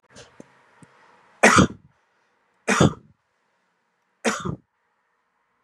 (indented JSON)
{
  "three_cough_length": "5.6 s",
  "three_cough_amplitude": 32637,
  "three_cough_signal_mean_std_ratio": 0.26,
  "survey_phase": "beta (2021-08-13 to 2022-03-07)",
  "age": "45-64",
  "gender": "Male",
  "wearing_mask": "No",
  "symptom_fatigue": true,
  "symptom_fever_high_temperature": true,
  "symptom_headache": true,
  "symptom_onset": "5 days",
  "smoker_status": "Ex-smoker",
  "respiratory_condition_asthma": false,
  "respiratory_condition_other": false,
  "recruitment_source": "Test and Trace",
  "submission_delay": "2 days",
  "covid_test_result": "Positive",
  "covid_test_method": "RT-qPCR",
  "covid_ct_value": 23.0,
  "covid_ct_gene": "N gene"
}